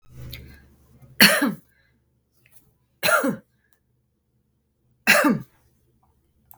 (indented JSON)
{
  "three_cough_length": "6.6 s",
  "three_cough_amplitude": 32768,
  "three_cough_signal_mean_std_ratio": 0.3,
  "survey_phase": "beta (2021-08-13 to 2022-03-07)",
  "age": "18-44",
  "gender": "Female",
  "wearing_mask": "No",
  "symptom_none": true,
  "smoker_status": "Ex-smoker",
  "respiratory_condition_asthma": false,
  "respiratory_condition_other": false,
  "recruitment_source": "REACT",
  "submission_delay": "7 days",
  "covid_test_result": "Negative",
  "covid_test_method": "RT-qPCR",
  "influenza_a_test_result": "Unknown/Void",
  "influenza_b_test_result": "Unknown/Void"
}